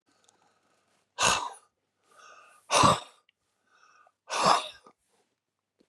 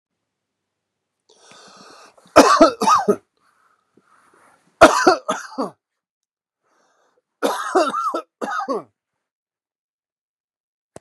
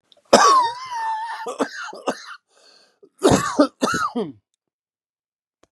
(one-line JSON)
{"exhalation_length": "5.9 s", "exhalation_amplitude": 16086, "exhalation_signal_mean_std_ratio": 0.3, "three_cough_length": "11.0 s", "three_cough_amplitude": 32768, "three_cough_signal_mean_std_ratio": 0.3, "cough_length": "5.7 s", "cough_amplitude": 32768, "cough_signal_mean_std_ratio": 0.44, "survey_phase": "beta (2021-08-13 to 2022-03-07)", "age": "65+", "gender": "Male", "wearing_mask": "No", "symptom_cough_any": true, "symptom_shortness_of_breath": true, "symptom_diarrhoea": true, "symptom_headache": true, "symptom_change_to_sense_of_smell_or_taste": true, "symptom_loss_of_taste": true, "symptom_onset": "2 days", "smoker_status": "Never smoked", "respiratory_condition_asthma": false, "respiratory_condition_other": false, "recruitment_source": "Test and Trace", "submission_delay": "2 days", "covid_test_result": "Positive", "covid_test_method": "RT-qPCR", "covid_ct_value": 16.4, "covid_ct_gene": "S gene", "covid_ct_mean": 17.0, "covid_viral_load": "2600000 copies/ml", "covid_viral_load_category": "High viral load (>1M copies/ml)"}